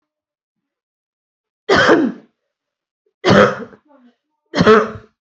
{
  "three_cough_length": "5.2 s",
  "three_cough_amplitude": 32767,
  "three_cough_signal_mean_std_ratio": 0.37,
  "survey_phase": "beta (2021-08-13 to 2022-03-07)",
  "age": "18-44",
  "gender": "Female",
  "wearing_mask": "Yes",
  "symptom_none": true,
  "smoker_status": "Never smoked",
  "respiratory_condition_asthma": false,
  "respiratory_condition_other": false,
  "recruitment_source": "REACT",
  "submission_delay": "1 day",
  "covid_test_result": "Negative",
  "covid_test_method": "RT-qPCR"
}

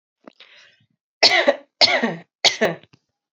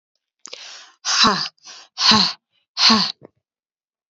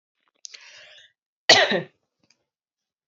{
  "three_cough_length": "3.3 s",
  "three_cough_amplitude": 32768,
  "three_cough_signal_mean_std_ratio": 0.38,
  "exhalation_length": "4.1 s",
  "exhalation_amplitude": 31696,
  "exhalation_signal_mean_std_ratio": 0.41,
  "cough_length": "3.1 s",
  "cough_amplitude": 31374,
  "cough_signal_mean_std_ratio": 0.24,
  "survey_phase": "alpha (2021-03-01 to 2021-08-12)",
  "age": "18-44",
  "gender": "Female",
  "wearing_mask": "No",
  "symptom_headache": true,
  "smoker_status": "Never smoked",
  "respiratory_condition_asthma": false,
  "respiratory_condition_other": false,
  "recruitment_source": "Test and Trace",
  "submission_delay": "2 days",
  "covid_test_result": "Positive",
  "covid_test_method": "RT-qPCR",
  "covid_ct_value": 19.0,
  "covid_ct_gene": "ORF1ab gene",
  "covid_ct_mean": 19.7,
  "covid_viral_load": "350000 copies/ml",
  "covid_viral_load_category": "Low viral load (10K-1M copies/ml)"
}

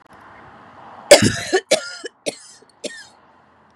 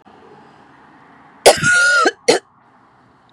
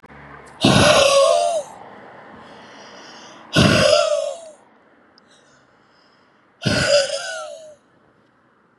{
  "cough_length": "3.8 s",
  "cough_amplitude": 32768,
  "cough_signal_mean_std_ratio": 0.29,
  "three_cough_length": "3.3 s",
  "three_cough_amplitude": 32768,
  "three_cough_signal_mean_std_ratio": 0.41,
  "exhalation_length": "8.8 s",
  "exhalation_amplitude": 30793,
  "exhalation_signal_mean_std_ratio": 0.47,
  "survey_phase": "beta (2021-08-13 to 2022-03-07)",
  "age": "18-44",
  "gender": "Female",
  "wearing_mask": "No",
  "symptom_sore_throat": true,
  "symptom_fatigue": true,
  "symptom_onset": "9 days",
  "smoker_status": "Current smoker (1 to 10 cigarettes per day)",
  "respiratory_condition_asthma": false,
  "respiratory_condition_other": false,
  "recruitment_source": "REACT",
  "submission_delay": "0 days",
  "covid_test_result": "Negative",
  "covid_test_method": "RT-qPCR",
  "influenza_a_test_result": "Unknown/Void",
  "influenza_b_test_result": "Unknown/Void"
}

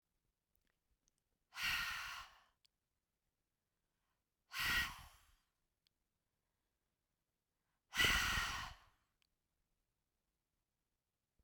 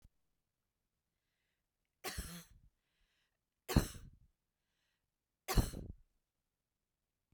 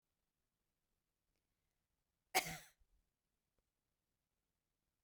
{
  "exhalation_length": "11.4 s",
  "exhalation_amplitude": 2760,
  "exhalation_signal_mean_std_ratio": 0.3,
  "three_cough_length": "7.3 s",
  "three_cough_amplitude": 5800,
  "three_cough_signal_mean_std_ratio": 0.2,
  "cough_length": "5.0 s",
  "cough_amplitude": 3675,
  "cough_signal_mean_std_ratio": 0.14,
  "survey_phase": "beta (2021-08-13 to 2022-03-07)",
  "age": "45-64",
  "gender": "Female",
  "wearing_mask": "No",
  "symptom_cough_any": true,
  "symptom_fatigue": true,
  "symptom_onset": "12 days",
  "smoker_status": "Never smoked",
  "respiratory_condition_asthma": false,
  "respiratory_condition_other": false,
  "recruitment_source": "REACT",
  "submission_delay": "4 days",
  "covid_test_result": "Negative",
  "covid_test_method": "RT-qPCR",
  "influenza_a_test_result": "Unknown/Void",
  "influenza_b_test_result": "Unknown/Void"
}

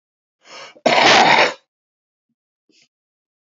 {
  "cough_length": "3.4 s",
  "cough_amplitude": 30654,
  "cough_signal_mean_std_ratio": 0.37,
  "survey_phase": "beta (2021-08-13 to 2022-03-07)",
  "age": "45-64",
  "gender": "Male",
  "wearing_mask": "No",
  "symptom_none": true,
  "smoker_status": "Current smoker (11 or more cigarettes per day)",
  "respiratory_condition_asthma": false,
  "respiratory_condition_other": false,
  "recruitment_source": "REACT",
  "submission_delay": "1 day",
  "covid_test_result": "Negative",
  "covid_test_method": "RT-qPCR",
  "influenza_a_test_result": "Negative",
  "influenza_b_test_result": "Negative"
}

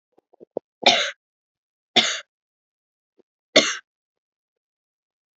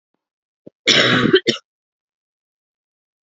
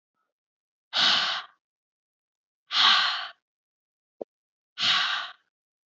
{
  "three_cough_length": "5.4 s",
  "three_cough_amplitude": 30141,
  "three_cough_signal_mean_std_ratio": 0.24,
  "cough_length": "3.2 s",
  "cough_amplitude": 32548,
  "cough_signal_mean_std_ratio": 0.34,
  "exhalation_length": "5.9 s",
  "exhalation_amplitude": 13156,
  "exhalation_signal_mean_std_ratio": 0.39,
  "survey_phase": "alpha (2021-03-01 to 2021-08-12)",
  "age": "18-44",
  "gender": "Female",
  "wearing_mask": "No",
  "symptom_cough_any": true,
  "symptom_new_continuous_cough": true,
  "symptom_shortness_of_breath": true,
  "symptom_fatigue": true,
  "symptom_headache": true,
  "symptom_change_to_sense_of_smell_or_taste": true,
  "symptom_loss_of_taste": true,
  "symptom_onset": "3 days",
  "smoker_status": "Never smoked",
  "respiratory_condition_asthma": false,
  "respiratory_condition_other": false,
  "recruitment_source": "Test and Trace",
  "submission_delay": "1 day",
  "covid_test_result": "Positive",
  "covid_test_method": "RT-qPCR",
  "covid_ct_value": 35.9,
  "covid_ct_gene": "N gene"
}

